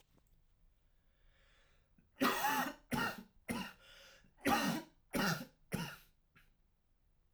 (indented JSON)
{
  "cough_length": "7.3 s",
  "cough_amplitude": 3143,
  "cough_signal_mean_std_ratio": 0.42,
  "survey_phase": "alpha (2021-03-01 to 2021-08-12)",
  "age": "18-44",
  "gender": "Male",
  "wearing_mask": "No",
  "symptom_none": true,
  "symptom_cough_any": true,
  "symptom_headache": true,
  "smoker_status": "Current smoker (1 to 10 cigarettes per day)",
  "respiratory_condition_asthma": false,
  "respiratory_condition_other": false,
  "recruitment_source": "REACT",
  "submission_delay": "1 day",
  "covid_test_result": "Negative",
  "covid_test_method": "RT-qPCR"
}